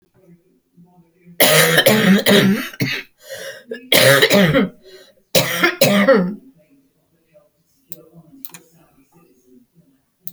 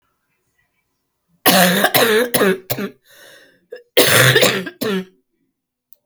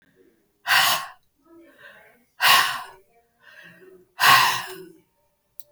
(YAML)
three_cough_length: 10.3 s
three_cough_amplitude: 32768
three_cough_signal_mean_std_ratio: 0.47
cough_length: 6.1 s
cough_amplitude: 32768
cough_signal_mean_std_ratio: 0.48
exhalation_length: 5.7 s
exhalation_amplitude: 26279
exhalation_signal_mean_std_ratio: 0.37
survey_phase: beta (2021-08-13 to 2022-03-07)
age: 65+
gender: Female
wearing_mask: 'No'
symptom_other: true
symptom_onset: 3 days
smoker_status: Ex-smoker
respiratory_condition_asthma: false
respiratory_condition_other: false
recruitment_source: Test and Trace
submission_delay: 1 day
covid_test_result: Negative
covid_test_method: RT-qPCR